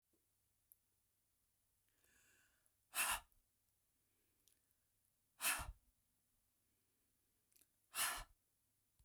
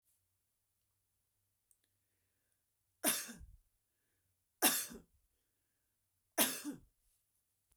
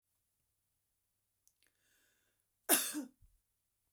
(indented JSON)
{
  "exhalation_length": "9.0 s",
  "exhalation_amplitude": 1579,
  "exhalation_signal_mean_std_ratio": 0.25,
  "three_cough_length": "7.8 s",
  "three_cough_amplitude": 5531,
  "three_cough_signal_mean_std_ratio": 0.23,
  "cough_length": "3.9 s",
  "cough_amplitude": 5947,
  "cough_signal_mean_std_ratio": 0.2,
  "survey_phase": "beta (2021-08-13 to 2022-03-07)",
  "age": "45-64",
  "gender": "Female",
  "wearing_mask": "No",
  "symptom_none": true,
  "symptom_onset": "11 days",
  "smoker_status": "Ex-smoker",
  "respiratory_condition_asthma": false,
  "respiratory_condition_other": false,
  "recruitment_source": "REACT",
  "submission_delay": "1 day",
  "covid_test_result": "Negative",
  "covid_test_method": "RT-qPCR",
  "influenza_a_test_result": "Negative",
  "influenza_b_test_result": "Negative"
}